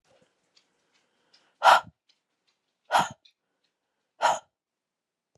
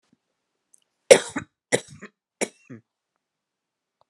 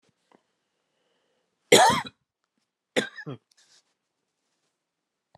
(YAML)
exhalation_length: 5.4 s
exhalation_amplitude: 23120
exhalation_signal_mean_std_ratio: 0.22
three_cough_length: 4.1 s
three_cough_amplitude: 32768
three_cough_signal_mean_std_ratio: 0.15
cough_length: 5.4 s
cough_amplitude: 25346
cough_signal_mean_std_ratio: 0.21
survey_phase: alpha (2021-03-01 to 2021-08-12)
age: 45-64
gender: Female
wearing_mask: 'No'
symptom_none: true
smoker_status: Never smoked
respiratory_condition_asthma: false
respiratory_condition_other: false
recruitment_source: REACT
submission_delay: 3 days
covid_test_result: Negative
covid_test_method: RT-qPCR